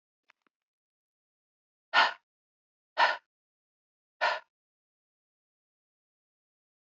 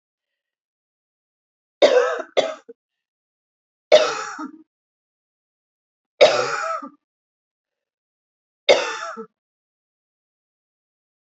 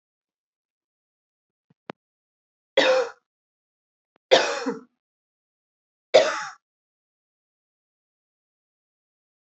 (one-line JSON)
{"exhalation_length": "7.0 s", "exhalation_amplitude": 10458, "exhalation_signal_mean_std_ratio": 0.2, "cough_length": "11.3 s", "cough_amplitude": 32553, "cough_signal_mean_std_ratio": 0.27, "three_cough_length": "9.5 s", "three_cough_amplitude": 26238, "three_cough_signal_mean_std_ratio": 0.23, "survey_phase": "alpha (2021-03-01 to 2021-08-12)", "age": "18-44", "gender": "Female", "wearing_mask": "No", "symptom_headache": true, "smoker_status": "Current smoker (1 to 10 cigarettes per day)", "respiratory_condition_asthma": false, "respiratory_condition_other": false, "recruitment_source": "Test and Trace", "submission_delay": "1 day", "covid_test_result": "Positive", "covid_test_method": "RT-qPCR", "covid_ct_value": 20.1, "covid_ct_gene": "ORF1ab gene", "covid_ct_mean": 20.4, "covid_viral_load": "200000 copies/ml", "covid_viral_load_category": "Low viral load (10K-1M copies/ml)"}